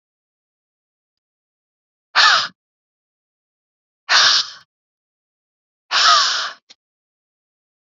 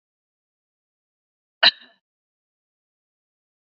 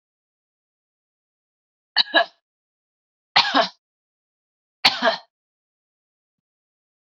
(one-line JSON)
{"exhalation_length": "7.9 s", "exhalation_amplitude": 32767, "exhalation_signal_mean_std_ratio": 0.31, "cough_length": "3.8 s", "cough_amplitude": 28041, "cough_signal_mean_std_ratio": 0.11, "three_cough_length": "7.2 s", "three_cough_amplitude": 30790, "three_cough_signal_mean_std_ratio": 0.23, "survey_phase": "beta (2021-08-13 to 2022-03-07)", "age": "18-44", "gender": "Female", "wearing_mask": "No", "symptom_none": true, "smoker_status": "Ex-smoker", "respiratory_condition_asthma": true, "respiratory_condition_other": false, "recruitment_source": "REACT", "submission_delay": "2 days", "covid_test_result": "Negative", "covid_test_method": "RT-qPCR", "influenza_a_test_result": "Unknown/Void", "influenza_b_test_result": "Unknown/Void"}